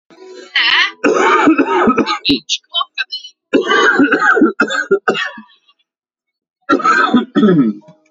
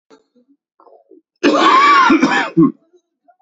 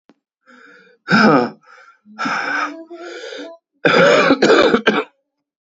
{"three_cough_length": "8.1 s", "three_cough_amplitude": 32767, "three_cough_signal_mean_std_ratio": 0.67, "cough_length": "3.4 s", "cough_amplitude": 28775, "cough_signal_mean_std_ratio": 0.53, "exhalation_length": "5.7 s", "exhalation_amplitude": 32418, "exhalation_signal_mean_std_ratio": 0.51, "survey_phase": "beta (2021-08-13 to 2022-03-07)", "age": "18-44", "gender": "Male", "wearing_mask": "No", "symptom_cough_any": true, "symptom_new_continuous_cough": true, "symptom_runny_or_blocked_nose": true, "symptom_shortness_of_breath": true, "symptom_sore_throat": true, "symptom_fatigue": true, "symptom_fever_high_temperature": true, "symptom_headache": true, "symptom_change_to_sense_of_smell_or_taste": true, "symptom_loss_of_taste": true, "symptom_other": true, "symptom_onset": "3 days", "smoker_status": "Never smoked", "respiratory_condition_asthma": false, "respiratory_condition_other": false, "recruitment_source": "Test and Trace", "submission_delay": "2 days", "covid_test_result": "Positive", "covid_test_method": "RT-qPCR", "covid_ct_value": 25.2, "covid_ct_gene": "N gene"}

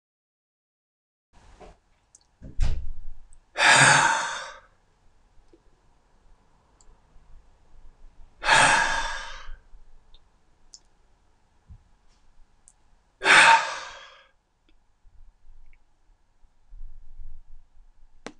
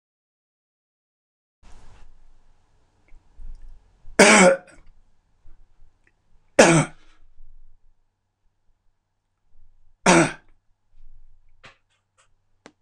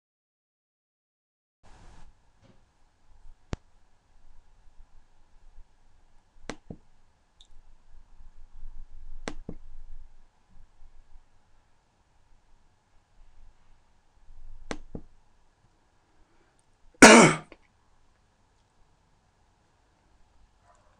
{"exhalation_length": "18.4 s", "exhalation_amplitude": 24153, "exhalation_signal_mean_std_ratio": 0.33, "three_cough_length": "12.8 s", "three_cough_amplitude": 26028, "three_cough_signal_mean_std_ratio": 0.24, "cough_length": "21.0 s", "cough_amplitude": 26028, "cough_signal_mean_std_ratio": 0.18, "survey_phase": "beta (2021-08-13 to 2022-03-07)", "age": "65+", "gender": "Male", "wearing_mask": "No", "symptom_none": true, "smoker_status": "Never smoked", "respiratory_condition_asthma": false, "respiratory_condition_other": false, "recruitment_source": "REACT", "submission_delay": "1 day", "covid_test_result": "Negative", "covid_test_method": "RT-qPCR"}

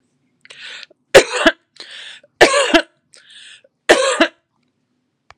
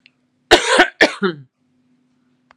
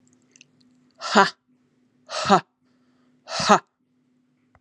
{"three_cough_length": "5.4 s", "three_cough_amplitude": 32768, "three_cough_signal_mean_std_ratio": 0.33, "cough_length": "2.6 s", "cough_amplitude": 32768, "cough_signal_mean_std_ratio": 0.34, "exhalation_length": "4.6 s", "exhalation_amplitude": 32393, "exhalation_signal_mean_std_ratio": 0.26, "survey_phase": "beta (2021-08-13 to 2022-03-07)", "age": "45-64", "gender": "Female", "wearing_mask": "No", "symptom_none": true, "smoker_status": "Ex-smoker", "respiratory_condition_asthma": false, "respiratory_condition_other": false, "recruitment_source": "REACT", "submission_delay": "4 days", "covid_test_result": "Negative", "covid_test_method": "RT-qPCR"}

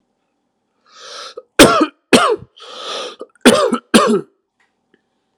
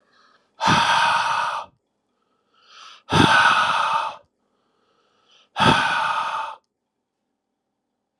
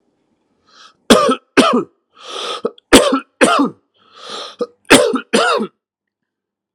{"cough_length": "5.4 s", "cough_amplitude": 32768, "cough_signal_mean_std_ratio": 0.38, "exhalation_length": "8.2 s", "exhalation_amplitude": 28430, "exhalation_signal_mean_std_ratio": 0.49, "three_cough_length": "6.7 s", "three_cough_amplitude": 32768, "three_cough_signal_mean_std_ratio": 0.43, "survey_phase": "alpha (2021-03-01 to 2021-08-12)", "age": "45-64", "gender": "Male", "wearing_mask": "No", "symptom_cough_any": true, "symptom_shortness_of_breath": true, "symptom_fatigue": true, "symptom_headache": true, "symptom_change_to_sense_of_smell_or_taste": true, "symptom_loss_of_taste": true, "symptom_onset": "11 days", "smoker_status": "Ex-smoker", "respiratory_condition_asthma": false, "respiratory_condition_other": false, "recruitment_source": "Test and Trace", "submission_delay": "3 days", "covid_test_result": "Positive", "covid_test_method": "RT-qPCR", "covid_ct_value": 18.1, "covid_ct_gene": "N gene", "covid_ct_mean": 18.3, "covid_viral_load": "970000 copies/ml", "covid_viral_load_category": "Low viral load (10K-1M copies/ml)"}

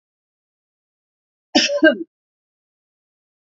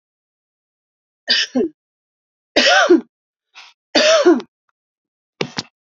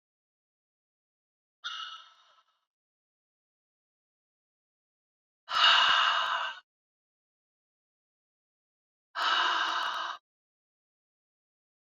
{"cough_length": "3.5 s", "cough_amplitude": 29910, "cough_signal_mean_std_ratio": 0.24, "three_cough_length": "6.0 s", "three_cough_amplitude": 29859, "three_cough_signal_mean_std_ratio": 0.37, "exhalation_length": "11.9 s", "exhalation_amplitude": 10857, "exhalation_signal_mean_std_ratio": 0.32, "survey_phase": "beta (2021-08-13 to 2022-03-07)", "age": "65+", "gender": "Female", "wearing_mask": "No", "symptom_none": true, "smoker_status": "Never smoked", "respiratory_condition_asthma": false, "respiratory_condition_other": false, "recruitment_source": "REACT", "submission_delay": "3 days", "covid_test_result": "Negative", "covid_test_method": "RT-qPCR"}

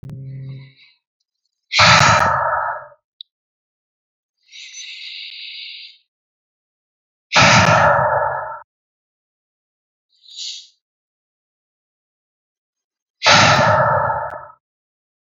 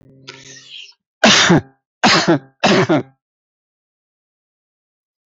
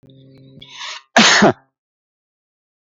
{"exhalation_length": "15.2 s", "exhalation_amplitude": 32768, "exhalation_signal_mean_std_ratio": 0.4, "three_cough_length": "5.3 s", "three_cough_amplitude": 32768, "three_cough_signal_mean_std_ratio": 0.39, "cough_length": "2.9 s", "cough_amplitude": 32768, "cough_signal_mean_std_ratio": 0.32, "survey_phase": "beta (2021-08-13 to 2022-03-07)", "age": "18-44", "gender": "Male", "wearing_mask": "No", "symptom_runny_or_blocked_nose": true, "symptom_change_to_sense_of_smell_or_taste": true, "symptom_onset": "7 days", "smoker_status": "Never smoked", "respiratory_condition_asthma": false, "respiratory_condition_other": false, "recruitment_source": "Test and Trace", "submission_delay": "1 day", "covid_test_result": "Positive", "covid_test_method": "ePCR"}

